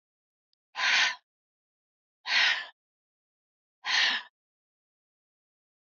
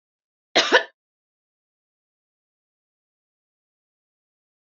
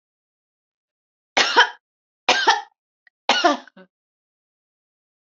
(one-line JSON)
{"exhalation_length": "6.0 s", "exhalation_amplitude": 9725, "exhalation_signal_mean_std_ratio": 0.34, "cough_length": "4.6 s", "cough_amplitude": 30774, "cough_signal_mean_std_ratio": 0.16, "three_cough_length": "5.3 s", "three_cough_amplitude": 28353, "three_cough_signal_mean_std_ratio": 0.3, "survey_phase": "beta (2021-08-13 to 2022-03-07)", "age": "65+", "gender": "Female", "wearing_mask": "No", "symptom_none": true, "smoker_status": "Never smoked", "respiratory_condition_asthma": false, "respiratory_condition_other": false, "recruitment_source": "REACT", "submission_delay": "1 day", "covid_test_result": "Negative", "covid_test_method": "RT-qPCR", "influenza_a_test_result": "Negative", "influenza_b_test_result": "Negative"}